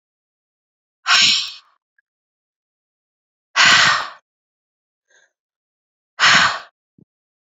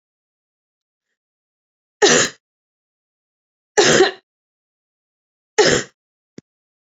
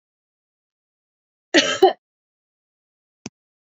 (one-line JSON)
{"exhalation_length": "7.6 s", "exhalation_amplitude": 32768, "exhalation_signal_mean_std_ratio": 0.32, "three_cough_length": "6.8 s", "three_cough_amplitude": 32185, "three_cough_signal_mean_std_ratio": 0.28, "cough_length": "3.7 s", "cough_amplitude": 31306, "cough_signal_mean_std_ratio": 0.21, "survey_phase": "beta (2021-08-13 to 2022-03-07)", "age": "45-64", "gender": "Female", "wearing_mask": "No", "symptom_none": true, "smoker_status": "Never smoked", "respiratory_condition_asthma": false, "respiratory_condition_other": false, "recruitment_source": "REACT", "submission_delay": "2 days", "covid_test_result": "Negative", "covid_test_method": "RT-qPCR", "influenza_a_test_result": "Negative", "influenza_b_test_result": "Negative"}